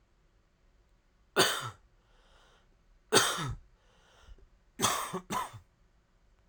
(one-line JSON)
{"three_cough_length": "6.5 s", "three_cough_amplitude": 12878, "three_cough_signal_mean_std_ratio": 0.34, "survey_phase": "alpha (2021-03-01 to 2021-08-12)", "age": "18-44", "gender": "Male", "wearing_mask": "No", "symptom_cough_any": true, "symptom_shortness_of_breath": true, "symptom_fatigue": true, "symptom_fever_high_temperature": true, "symptom_change_to_sense_of_smell_or_taste": true, "symptom_onset": "5 days", "smoker_status": "Ex-smoker", "respiratory_condition_asthma": true, "respiratory_condition_other": false, "recruitment_source": "Test and Trace", "submission_delay": "2 days", "covid_test_result": "Positive", "covid_test_method": "RT-qPCR", "covid_ct_value": 26.9, "covid_ct_gene": "N gene"}